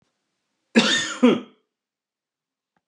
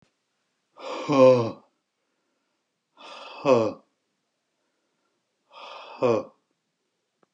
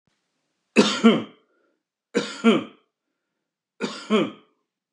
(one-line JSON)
{"cough_length": "2.9 s", "cough_amplitude": 25913, "cough_signal_mean_std_ratio": 0.32, "exhalation_length": "7.3 s", "exhalation_amplitude": 19130, "exhalation_signal_mean_std_ratio": 0.3, "three_cough_length": "4.9 s", "three_cough_amplitude": 25510, "three_cough_signal_mean_std_ratio": 0.34, "survey_phase": "beta (2021-08-13 to 2022-03-07)", "age": "45-64", "gender": "Male", "wearing_mask": "No", "symptom_none": true, "smoker_status": "Ex-smoker", "respiratory_condition_asthma": false, "respiratory_condition_other": false, "recruitment_source": "REACT", "submission_delay": "1 day", "covid_test_result": "Negative", "covid_test_method": "RT-qPCR", "influenza_a_test_result": "Negative", "influenza_b_test_result": "Negative"}